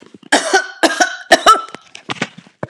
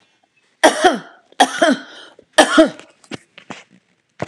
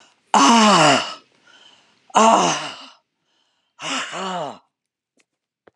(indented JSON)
{
  "cough_length": "2.7 s",
  "cough_amplitude": 32768,
  "cough_signal_mean_std_ratio": 0.44,
  "three_cough_length": "4.3 s",
  "three_cough_amplitude": 32768,
  "three_cough_signal_mean_std_ratio": 0.36,
  "exhalation_length": "5.8 s",
  "exhalation_amplitude": 31455,
  "exhalation_signal_mean_std_ratio": 0.43,
  "survey_phase": "beta (2021-08-13 to 2022-03-07)",
  "age": "65+",
  "gender": "Female",
  "wearing_mask": "No",
  "symptom_none": true,
  "smoker_status": "Never smoked",
  "respiratory_condition_asthma": false,
  "respiratory_condition_other": false,
  "recruitment_source": "REACT",
  "submission_delay": "6 days",
  "covid_test_result": "Negative",
  "covid_test_method": "RT-qPCR",
  "influenza_a_test_result": "Negative",
  "influenza_b_test_result": "Negative"
}